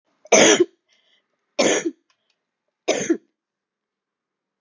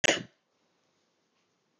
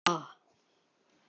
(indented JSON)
{
  "three_cough_length": "4.6 s",
  "three_cough_amplitude": 29144,
  "three_cough_signal_mean_std_ratio": 0.32,
  "cough_length": "1.8 s",
  "cough_amplitude": 11105,
  "cough_signal_mean_std_ratio": 0.2,
  "exhalation_length": "1.3 s",
  "exhalation_amplitude": 9002,
  "exhalation_signal_mean_std_ratio": 0.24,
  "survey_phase": "alpha (2021-03-01 to 2021-08-12)",
  "age": "65+",
  "gender": "Female",
  "wearing_mask": "No",
  "symptom_none": true,
  "smoker_status": "Never smoked",
  "respiratory_condition_asthma": false,
  "respiratory_condition_other": false,
  "recruitment_source": "Test and Trace",
  "submission_delay": "1 day",
  "covid_test_result": "Positive",
  "covid_test_method": "RT-qPCR",
  "covid_ct_value": 15.5,
  "covid_ct_gene": "ORF1ab gene",
  "covid_ct_mean": 16.8,
  "covid_viral_load": "3000000 copies/ml",
  "covid_viral_load_category": "High viral load (>1M copies/ml)"
}